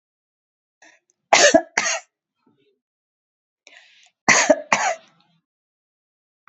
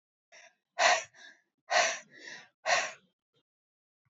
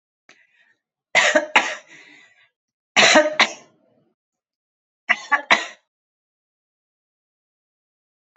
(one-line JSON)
{"cough_length": "6.5 s", "cough_amplitude": 32767, "cough_signal_mean_std_ratio": 0.28, "exhalation_length": "4.1 s", "exhalation_amplitude": 10669, "exhalation_signal_mean_std_ratio": 0.35, "three_cough_length": "8.4 s", "three_cough_amplitude": 31351, "three_cough_signal_mean_std_ratio": 0.28, "survey_phase": "beta (2021-08-13 to 2022-03-07)", "age": "45-64", "gender": "Female", "wearing_mask": "No", "symptom_none": true, "smoker_status": "Current smoker (1 to 10 cigarettes per day)", "respiratory_condition_asthma": false, "respiratory_condition_other": false, "recruitment_source": "REACT", "submission_delay": "2 days", "covid_test_result": "Negative", "covid_test_method": "RT-qPCR"}